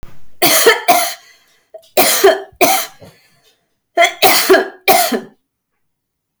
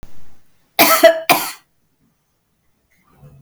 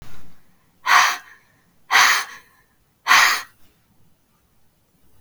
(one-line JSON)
{"three_cough_length": "6.4 s", "three_cough_amplitude": 32768, "three_cough_signal_mean_std_ratio": 0.51, "cough_length": "3.4 s", "cough_amplitude": 32768, "cough_signal_mean_std_ratio": 0.36, "exhalation_length": "5.2 s", "exhalation_amplitude": 32263, "exhalation_signal_mean_std_ratio": 0.39, "survey_phase": "beta (2021-08-13 to 2022-03-07)", "age": "45-64", "gender": "Female", "wearing_mask": "No", "symptom_none": true, "symptom_onset": "12 days", "smoker_status": "Never smoked", "respiratory_condition_asthma": false, "respiratory_condition_other": false, "recruitment_source": "REACT", "submission_delay": "4 days", "covid_test_result": "Negative", "covid_test_method": "RT-qPCR", "influenza_a_test_result": "Negative", "influenza_b_test_result": "Negative"}